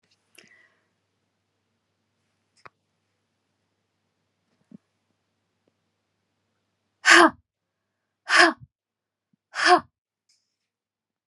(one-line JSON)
{"exhalation_length": "11.3 s", "exhalation_amplitude": 30158, "exhalation_signal_mean_std_ratio": 0.19, "survey_phase": "beta (2021-08-13 to 2022-03-07)", "age": "45-64", "gender": "Female", "wearing_mask": "No", "symptom_none": true, "smoker_status": "Never smoked", "respiratory_condition_asthma": false, "respiratory_condition_other": false, "recruitment_source": "REACT", "submission_delay": "1 day", "covid_test_result": "Negative", "covid_test_method": "RT-qPCR", "influenza_a_test_result": "Negative", "influenza_b_test_result": "Negative"}